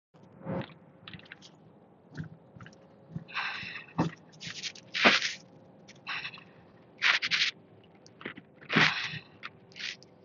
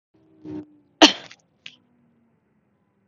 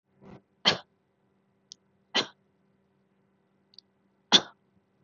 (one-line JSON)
{"exhalation_length": "10.2 s", "exhalation_amplitude": 15923, "exhalation_signal_mean_std_ratio": 0.4, "cough_length": "3.1 s", "cough_amplitude": 32768, "cough_signal_mean_std_ratio": 0.16, "three_cough_length": "5.0 s", "three_cough_amplitude": 21054, "three_cough_signal_mean_std_ratio": 0.18, "survey_phase": "beta (2021-08-13 to 2022-03-07)", "age": "18-44", "gender": "Female", "wearing_mask": "Yes", "symptom_fatigue": true, "symptom_onset": "12 days", "smoker_status": "Never smoked", "respiratory_condition_asthma": false, "respiratory_condition_other": false, "recruitment_source": "REACT", "submission_delay": "1 day", "covid_test_result": "Negative", "covid_test_method": "RT-qPCR", "influenza_a_test_result": "Unknown/Void", "influenza_b_test_result": "Unknown/Void"}